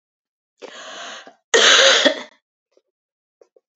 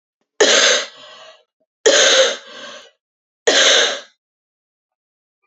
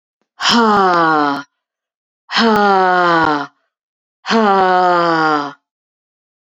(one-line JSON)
{"cough_length": "3.8 s", "cough_amplitude": 30965, "cough_signal_mean_std_ratio": 0.35, "three_cough_length": "5.5 s", "three_cough_amplitude": 30401, "three_cough_signal_mean_std_ratio": 0.44, "exhalation_length": "6.5 s", "exhalation_amplitude": 29974, "exhalation_signal_mean_std_ratio": 0.62, "survey_phase": "beta (2021-08-13 to 2022-03-07)", "age": "18-44", "gender": "Female", "wearing_mask": "No", "symptom_cough_any": true, "symptom_runny_or_blocked_nose": true, "symptom_sore_throat": true, "symptom_fatigue": true, "symptom_headache": true, "symptom_change_to_sense_of_smell_or_taste": true, "symptom_onset": "2 days", "smoker_status": "Never smoked", "respiratory_condition_asthma": false, "respiratory_condition_other": false, "recruitment_source": "Test and Trace", "submission_delay": "1 day", "covid_test_result": "Positive", "covid_test_method": "RT-qPCR", "covid_ct_value": 17.2, "covid_ct_gene": "N gene", "covid_ct_mean": 17.8, "covid_viral_load": "1400000 copies/ml", "covid_viral_load_category": "High viral load (>1M copies/ml)"}